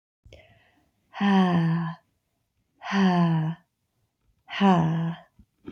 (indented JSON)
{
  "exhalation_length": "5.7 s",
  "exhalation_amplitude": 11643,
  "exhalation_signal_mean_std_ratio": 0.55,
  "survey_phase": "beta (2021-08-13 to 2022-03-07)",
  "age": "18-44",
  "gender": "Female",
  "wearing_mask": "No",
  "symptom_new_continuous_cough": true,
  "symptom_sore_throat": true,
  "symptom_fatigue": true,
  "symptom_fever_high_temperature": true,
  "symptom_headache": true,
  "symptom_onset": "3 days",
  "smoker_status": "Never smoked",
  "respiratory_condition_asthma": false,
  "respiratory_condition_other": false,
  "recruitment_source": "Test and Trace",
  "submission_delay": "1 day",
  "covid_test_result": "Positive",
  "covid_test_method": "RT-qPCR",
  "covid_ct_value": 19.8,
  "covid_ct_gene": "ORF1ab gene",
  "covid_ct_mean": 21.2,
  "covid_viral_load": "120000 copies/ml",
  "covid_viral_load_category": "Low viral load (10K-1M copies/ml)"
}